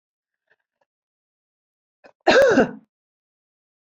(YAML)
cough_length: 3.8 s
cough_amplitude: 22400
cough_signal_mean_std_ratio: 0.27
survey_phase: alpha (2021-03-01 to 2021-08-12)
age: 45-64
gender: Female
wearing_mask: 'No'
symptom_none: true
smoker_status: Never smoked
respiratory_condition_asthma: true
respiratory_condition_other: false
recruitment_source: REACT
submission_delay: 2 days
covid_test_result: Negative
covid_test_method: RT-qPCR